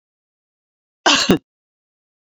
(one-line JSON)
{"cough_length": "2.2 s", "cough_amplitude": 29682, "cough_signal_mean_std_ratio": 0.28, "survey_phase": "alpha (2021-03-01 to 2021-08-12)", "age": "45-64", "gender": "Female", "wearing_mask": "No", "symptom_none": true, "smoker_status": "Never smoked", "respiratory_condition_asthma": false, "respiratory_condition_other": false, "recruitment_source": "REACT", "submission_delay": "1 day", "covid_test_result": "Negative", "covid_test_method": "RT-qPCR", "covid_ct_value": 41.0, "covid_ct_gene": "N gene"}